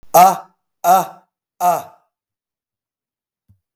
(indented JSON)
{
  "exhalation_length": "3.8 s",
  "exhalation_amplitude": 32768,
  "exhalation_signal_mean_std_ratio": 0.32,
  "survey_phase": "beta (2021-08-13 to 2022-03-07)",
  "age": "45-64",
  "gender": "Male",
  "wearing_mask": "No",
  "symptom_runny_or_blocked_nose": true,
  "symptom_fatigue": true,
  "symptom_change_to_sense_of_smell_or_taste": true,
  "smoker_status": "Ex-smoker",
  "respiratory_condition_asthma": true,
  "respiratory_condition_other": false,
  "recruitment_source": "Test and Trace",
  "submission_delay": "0 days",
  "covid_test_result": "Positive",
  "covid_test_method": "LFT"
}